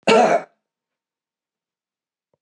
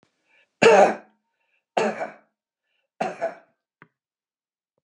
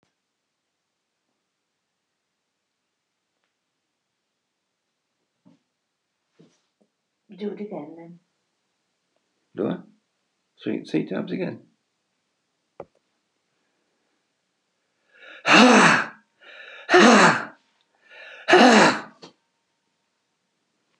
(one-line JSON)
{"cough_length": "2.4 s", "cough_amplitude": 23949, "cough_signal_mean_std_ratio": 0.3, "three_cough_length": "4.8 s", "three_cough_amplitude": 27788, "three_cough_signal_mean_std_ratio": 0.28, "exhalation_length": "21.0 s", "exhalation_amplitude": 31098, "exhalation_signal_mean_std_ratio": 0.26, "survey_phase": "beta (2021-08-13 to 2022-03-07)", "age": "65+", "gender": "Male", "wearing_mask": "No", "symptom_none": true, "smoker_status": "Ex-smoker", "respiratory_condition_asthma": false, "respiratory_condition_other": false, "recruitment_source": "REACT", "submission_delay": "5 days", "covid_test_result": "Negative", "covid_test_method": "RT-qPCR"}